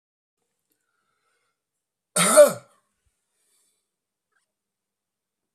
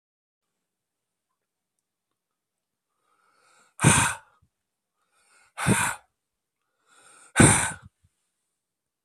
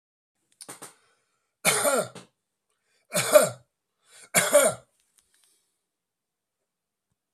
{
  "cough_length": "5.5 s",
  "cough_amplitude": 27634,
  "cough_signal_mean_std_ratio": 0.18,
  "exhalation_length": "9.0 s",
  "exhalation_amplitude": 25235,
  "exhalation_signal_mean_std_ratio": 0.24,
  "three_cough_length": "7.3 s",
  "three_cough_amplitude": 24617,
  "three_cough_signal_mean_std_ratio": 0.29,
  "survey_phase": "beta (2021-08-13 to 2022-03-07)",
  "age": "65+",
  "gender": "Male",
  "wearing_mask": "No",
  "symptom_none": true,
  "smoker_status": "Ex-smoker",
  "respiratory_condition_asthma": false,
  "respiratory_condition_other": false,
  "recruitment_source": "REACT",
  "submission_delay": "3 days",
  "covid_test_result": "Negative",
  "covid_test_method": "RT-qPCR"
}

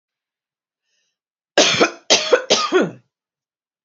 {
  "three_cough_length": "3.8 s",
  "three_cough_amplitude": 32767,
  "three_cough_signal_mean_std_ratio": 0.39,
  "survey_phase": "beta (2021-08-13 to 2022-03-07)",
  "age": "45-64",
  "gender": "Female",
  "wearing_mask": "No",
  "symptom_runny_or_blocked_nose": true,
  "symptom_other": true,
  "smoker_status": "Never smoked",
  "respiratory_condition_asthma": false,
  "respiratory_condition_other": false,
  "recruitment_source": "REACT",
  "submission_delay": "1 day",
  "covid_test_result": "Negative",
  "covid_test_method": "RT-qPCR"
}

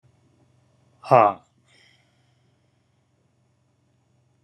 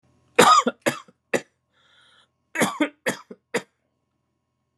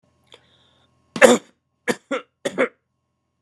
{
  "exhalation_length": "4.4 s",
  "exhalation_amplitude": 28698,
  "exhalation_signal_mean_std_ratio": 0.16,
  "cough_length": "4.8 s",
  "cough_amplitude": 30441,
  "cough_signal_mean_std_ratio": 0.3,
  "three_cough_length": "3.4 s",
  "three_cough_amplitude": 32768,
  "three_cough_signal_mean_std_ratio": 0.25,
  "survey_phase": "beta (2021-08-13 to 2022-03-07)",
  "age": "45-64",
  "gender": "Male",
  "wearing_mask": "No",
  "symptom_cough_any": true,
  "symptom_sore_throat": true,
  "symptom_fatigue": true,
  "symptom_change_to_sense_of_smell_or_taste": true,
  "symptom_loss_of_taste": true,
  "symptom_onset": "5 days",
  "smoker_status": "Ex-smoker",
  "respiratory_condition_asthma": true,
  "respiratory_condition_other": false,
  "recruitment_source": "Test and Trace",
  "submission_delay": "1 day",
  "covid_test_result": "Positive",
  "covid_test_method": "RT-qPCR",
  "covid_ct_value": 16.0,
  "covid_ct_gene": "ORF1ab gene",
  "covid_ct_mean": 16.8,
  "covid_viral_load": "3100000 copies/ml",
  "covid_viral_load_category": "High viral load (>1M copies/ml)"
}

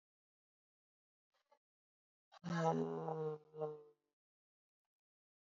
{
  "exhalation_length": "5.5 s",
  "exhalation_amplitude": 2168,
  "exhalation_signal_mean_std_ratio": 0.35,
  "survey_phase": "alpha (2021-03-01 to 2021-08-12)",
  "age": "45-64",
  "gender": "Female",
  "wearing_mask": "Yes",
  "symptom_cough_any": true,
  "symptom_fatigue": true,
  "symptom_fever_high_temperature": true,
  "symptom_headache": true,
  "symptom_loss_of_taste": true,
  "symptom_onset": "8 days",
  "smoker_status": "Never smoked",
  "respiratory_condition_asthma": false,
  "respiratory_condition_other": false,
  "recruitment_source": "Test and Trace",
  "submission_delay": "2 days",
  "covid_test_result": "Positive",
  "covid_test_method": "RT-qPCR"
}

